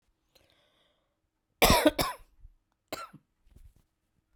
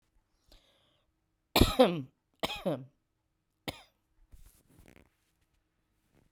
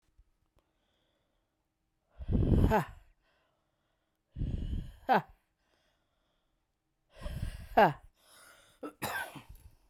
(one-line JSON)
{"cough_length": "4.4 s", "cough_amplitude": 15521, "cough_signal_mean_std_ratio": 0.25, "three_cough_length": "6.3 s", "three_cough_amplitude": 11010, "three_cough_signal_mean_std_ratio": 0.23, "exhalation_length": "9.9 s", "exhalation_amplitude": 8885, "exhalation_signal_mean_std_ratio": 0.33, "survey_phase": "beta (2021-08-13 to 2022-03-07)", "age": "45-64", "gender": "Female", "wearing_mask": "No", "symptom_headache": true, "symptom_change_to_sense_of_smell_or_taste": true, "symptom_onset": "13 days", "smoker_status": "Ex-smoker", "respiratory_condition_asthma": false, "respiratory_condition_other": false, "recruitment_source": "REACT", "submission_delay": "0 days", "covid_test_result": "Negative", "covid_test_method": "RT-qPCR", "influenza_a_test_result": "Unknown/Void", "influenza_b_test_result": "Unknown/Void"}